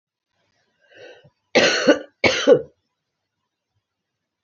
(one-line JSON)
{"cough_length": "4.4 s", "cough_amplitude": 27075, "cough_signal_mean_std_ratio": 0.31, "survey_phase": "beta (2021-08-13 to 2022-03-07)", "age": "45-64", "gender": "Female", "wearing_mask": "No", "symptom_cough_any": true, "symptom_runny_or_blocked_nose": true, "symptom_shortness_of_breath": true, "symptom_fatigue": true, "symptom_headache": true, "symptom_onset": "3 days", "smoker_status": "Never smoked", "respiratory_condition_asthma": false, "respiratory_condition_other": false, "recruitment_source": "Test and Trace", "submission_delay": "1 day", "covid_test_result": "Positive", "covid_test_method": "RT-qPCR", "covid_ct_value": 30.2, "covid_ct_gene": "ORF1ab gene"}